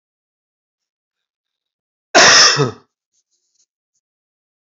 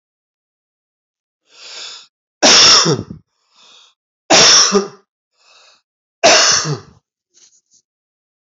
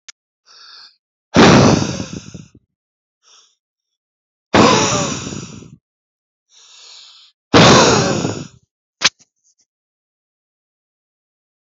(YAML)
cough_length: 4.6 s
cough_amplitude: 32738
cough_signal_mean_std_ratio: 0.28
three_cough_length: 8.5 s
three_cough_amplitude: 32768
three_cough_signal_mean_std_ratio: 0.37
exhalation_length: 11.7 s
exhalation_amplitude: 32365
exhalation_signal_mean_std_ratio: 0.35
survey_phase: alpha (2021-03-01 to 2021-08-12)
age: 45-64
gender: Male
wearing_mask: 'No'
symptom_none: true
smoker_status: Never smoked
respiratory_condition_asthma: true
respiratory_condition_other: false
recruitment_source: REACT
submission_delay: 1 day
covid_test_result: Negative
covid_test_method: RT-qPCR